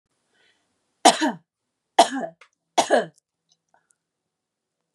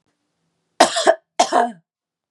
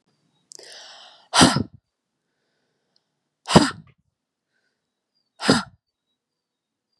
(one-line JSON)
{"three_cough_length": "4.9 s", "three_cough_amplitude": 32415, "three_cough_signal_mean_std_ratio": 0.25, "cough_length": "2.3 s", "cough_amplitude": 32768, "cough_signal_mean_std_ratio": 0.36, "exhalation_length": "7.0 s", "exhalation_amplitude": 32768, "exhalation_signal_mean_std_ratio": 0.22, "survey_phase": "beta (2021-08-13 to 2022-03-07)", "age": "18-44", "gender": "Female", "wearing_mask": "No", "symptom_none": true, "smoker_status": "Never smoked", "respiratory_condition_asthma": false, "respiratory_condition_other": false, "recruitment_source": "REACT", "submission_delay": "5 days", "covid_test_result": "Negative", "covid_test_method": "RT-qPCR", "influenza_a_test_result": "Negative", "influenza_b_test_result": "Negative"}